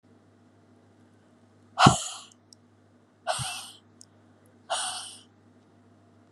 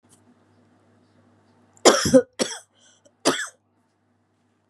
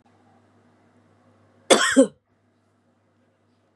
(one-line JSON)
{"exhalation_length": "6.3 s", "exhalation_amplitude": 31090, "exhalation_signal_mean_std_ratio": 0.25, "three_cough_length": "4.7 s", "three_cough_amplitude": 32726, "three_cough_signal_mean_std_ratio": 0.25, "cough_length": "3.8 s", "cough_amplitude": 28184, "cough_signal_mean_std_ratio": 0.23, "survey_phase": "beta (2021-08-13 to 2022-03-07)", "age": "45-64", "gender": "Female", "wearing_mask": "No", "symptom_cough_any": true, "symptom_runny_or_blocked_nose": true, "symptom_fatigue": true, "symptom_headache": true, "symptom_change_to_sense_of_smell_or_taste": true, "symptom_other": true, "smoker_status": "Ex-smoker", "respiratory_condition_asthma": false, "respiratory_condition_other": false, "recruitment_source": "Test and Trace", "submission_delay": "2 days", "covid_test_result": "Positive", "covid_test_method": "ePCR"}